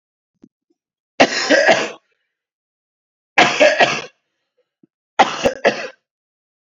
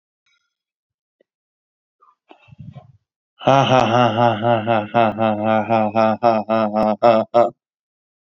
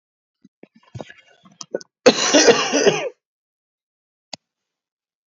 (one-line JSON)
{"three_cough_length": "6.7 s", "three_cough_amplitude": 29317, "three_cough_signal_mean_std_ratio": 0.37, "exhalation_length": "8.3 s", "exhalation_amplitude": 30347, "exhalation_signal_mean_std_ratio": 0.52, "cough_length": "5.3 s", "cough_amplitude": 32768, "cough_signal_mean_std_ratio": 0.32, "survey_phase": "beta (2021-08-13 to 2022-03-07)", "age": "18-44", "gender": "Male", "wearing_mask": "No", "symptom_none": true, "smoker_status": "Never smoked", "respiratory_condition_asthma": false, "respiratory_condition_other": false, "recruitment_source": "REACT", "submission_delay": "2 days", "covid_test_result": "Positive", "covid_test_method": "RT-qPCR", "covid_ct_value": 36.0, "covid_ct_gene": "N gene", "influenza_a_test_result": "Negative", "influenza_b_test_result": "Negative"}